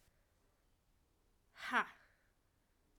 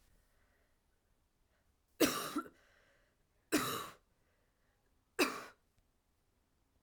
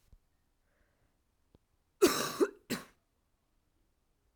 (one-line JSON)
{"exhalation_length": "3.0 s", "exhalation_amplitude": 3268, "exhalation_signal_mean_std_ratio": 0.22, "three_cough_length": "6.8 s", "three_cough_amplitude": 5360, "three_cough_signal_mean_std_ratio": 0.27, "cough_length": "4.4 s", "cough_amplitude": 6912, "cough_signal_mean_std_ratio": 0.24, "survey_phase": "beta (2021-08-13 to 2022-03-07)", "age": "18-44", "gender": "Female", "wearing_mask": "Yes", "symptom_cough_any": true, "symptom_new_continuous_cough": true, "symptom_runny_or_blocked_nose": true, "symptom_shortness_of_breath": true, "symptom_sore_throat": true, "symptom_abdominal_pain": true, "symptom_fatigue": true, "symptom_fever_high_temperature": true, "symptom_headache": true, "symptom_change_to_sense_of_smell_or_taste": true, "symptom_onset": "3 days", "smoker_status": "Current smoker (1 to 10 cigarettes per day)", "respiratory_condition_asthma": false, "respiratory_condition_other": false, "recruitment_source": "Test and Trace", "submission_delay": "2 days", "covid_test_result": "Positive", "covid_test_method": "RT-qPCR", "covid_ct_value": 15.5, "covid_ct_gene": "ORF1ab gene", "covid_ct_mean": 16.0, "covid_viral_load": "5700000 copies/ml", "covid_viral_load_category": "High viral load (>1M copies/ml)"}